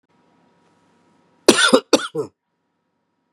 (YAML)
cough_length: 3.3 s
cough_amplitude: 32768
cough_signal_mean_std_ratio: 0.27
survey_phase: beta (2021-08-13 to 2022-03-07)
age: 45-64
gender: Male
wearing_mask: 'No'
symptom_new_continuous_cough: true
symptom_runny_or_blocked_nose: true
symptom_fatigue: true
symptom_fever_high_temperature: true
symptom_headache: true
symptom_change_to_sense_of_smell_or_taste: true
symptom_loss_of_taste: true
smoker_status: Never smoked
respiratory_condition_asthma: false
respiratory_condition_other: false
recruitment_source: Test and Trace
submission_delay: 2 days
covid_test_result: Positive
covid_test_method: RT-qPCR
covid_ct_value: 20.4
covid_ct_gene: N gene